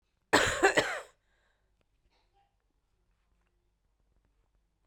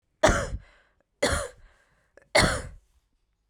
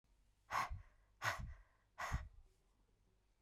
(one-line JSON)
{"cough_length": "4.9 s", "cough_amplitude": 12898, "cough_signal_mean_std_ratio": 0.25, "three_cough_length": "3.5 s", "three_cough_amplitude": 17831, "three_cough_signal_mean_std_ratio": 0.37, "exhalation_length": "3.4 s", "exhalation_amplitude": 1857, "exhalation_signal_mean_std_ratio": 0.42, "survey_phase": "beta (2021-08-13 to 2022-03-07)", "age": "18-44", "gender": "Female", "wearing_mask": "No", "symptom_none": true, "smoker_status": "Current smoker (1 to 10 cigarettes per day)", "respiratory_condition_asthma": true, "respiratory_condition_other": false, "recruitment_source": "REACT", "submission_delay": "0 days", "covid_test_result": "Negative", "covid_test_method": "RT-qPCR"}